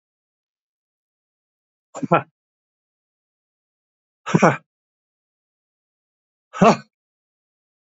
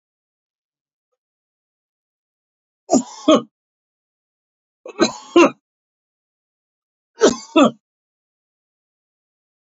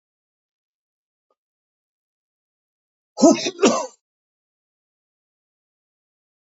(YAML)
exhalation_length: 7.9 s
exhalation_amplitude: 27576
exhalation_signal_mean_std_ratio: 0.18
three_cough_length: 9.7 s
three_cough_amplitude: 30711
three_cough_signal_mean_std_ratio: 0.22
cough_length: 6.5 s
cough_amplitude: 27404
cough_signal_mean_std_ratio: 0.19
survey_phase: beta (2021-08-13 to 2022-03-07)
age: 65+
gender: Male
wearing_mask: 'No'
symptom_none: true
symptom_onset: 8 days
smoker_status: Ex-smoker
respiratory_condition_asthma: false
respiratory_condition_other: false
recruitment_source: Test and Trace
submission_delay: 2 days
covid_test_result: Positive
covid_test_method: ePCR